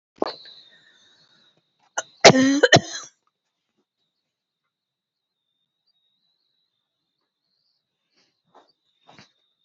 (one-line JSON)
{"cough_length": "9.6 s", "cough_amplitude": 32768, "cough_signal_mean_std_ratio": 0.18, "survey_phase": "beta (2021-08-13 to 2022-03-07)", "age": "45-64", "gender": "Female", "wearing_mask": "No", "symptom_none": true, "smoker_status": "Never smoked", "respiratory_condition_asthma": true, "respiratory_condition_other": false, "recruitment_source": "REACT", "submission_delay": "1 day", "covid_test_result": "Negative", "covid_test_method": "RT-qPCR"}